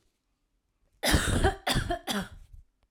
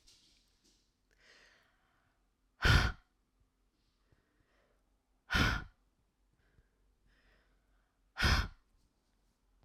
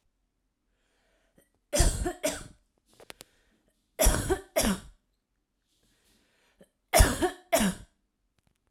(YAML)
cough_length: 2.9 s
cough_amplitude: 8550
cough_signal_mean_std_ratio: 0.5
exhalation_length: 9.6 s
exhalation_amplitude: 6395
exhalation_signal_mean_std_ratio: 0.24
three_cough_length: 8.7 s
three_cough_amplitude: 18200
three_cough_signal_mean_std_ratio: 0.33
survey_phase: beta (2021-08-13 to 2022-03-07)
age: 45-64
gender: Female
wearing_mask: 'No'
symptom_none: true
smoker_status: Never smoked
respiratory_condition_asthma: false
respiratory_condition_other: false
recruitment_source: REACT
submission_delay: 1 day
covid_test_result: Negative
covid_test_method: RT-qPCR